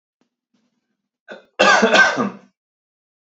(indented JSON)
{
  "cough_length": "3.3 s",
  "cough_amplitude": 32767,
  "cough_signal_mean_std_ratio": 0.36,
  "survey_phase": "beta (2021-08-13 to 2022-03-07)",
  "age": "18-44",
  "gender": "Male",
  "wearing_mask": "No",
  "symptom_none": true,
  "symptom_onset": "13 days",
  "smoker_status": "Never smoked",
  "respiratory_condition_asthma": false,
  "respiratory_condition_other": false,
  "recruitment_source": "REACT",
  "submission_delay": "2 days",
  "covid_test_result": "Negative",
  "covid_test_method": "RT-qPCR",
  "influenza_a_test_result": "Unknown/Void",
  "influenza_b_test_result": "Unknown/Void"
}